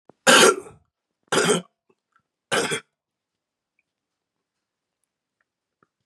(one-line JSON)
{"three_cough_length": "6.1 s", "three_cough_amplitude": 29081, "three_cough_signal_mean_std_ratio": 0.27, "survey_phase": "beta (2021-08-13 to 2022-03-07)", "age": "18-44", "gender": "Male", "wearing_mask": "No", "symptom_cough_any": true, "symptom_runny_or_blocked_nose": true, "symptom_sore_throat": true, "symptom_abdominal_pain": true, "symptom_onset": "3 days", "smoker_status": "Ex-smoker", "respiratory_condition_asthma": false, "respiratory_condition_other": false, "recruitment_source": "Test and Trace", "submission_delay": "2 days", "covid_test_result": "Positive", "covid_test_method": "RT-qPCR", "covid_ct_value": 22.9, "covid_ct_gene": "N gene", "covid_ct_mean": 22.9, "covid_viral_load": "30000 copies/ml", "covid_viral_load_category": "Low viral load (10K-1M copies/ml)"}